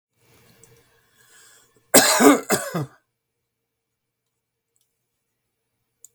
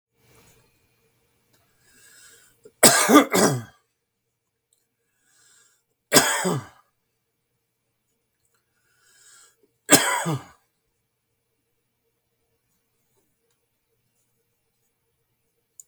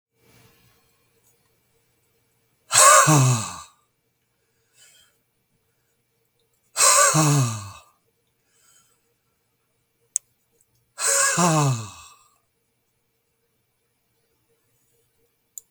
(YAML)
cough_length: 6.1 s
cough_amplitude: 32766
cough_signal_mean_std_ratio: 0.25
three_cough_length: 15.9 s
three_cough_amplitude: 32768
three_cough_signal_mean_std_ratio: 0.22
exhalation_length: 15.7 s
exhalation_amplitude: 32758
exhalation_signal_mean_std_ratio: 0.31
survey_phase: beta (2021-08-13 to 2022-03-07)
age: 65+
gender: Male
wearing_mask: 'No'
symptom_cough_any: true
symptom_runny_or_blocked_nose: true
symptom_onset: 13 days
smoker_status: Ex-smoker
respiratory_condition_asthma: false
respiratory_condition_other: false
recruitment_source: REACT
submission_delay: 7 days
covid_test_result: Negative
covid_test_method: RT-qPCR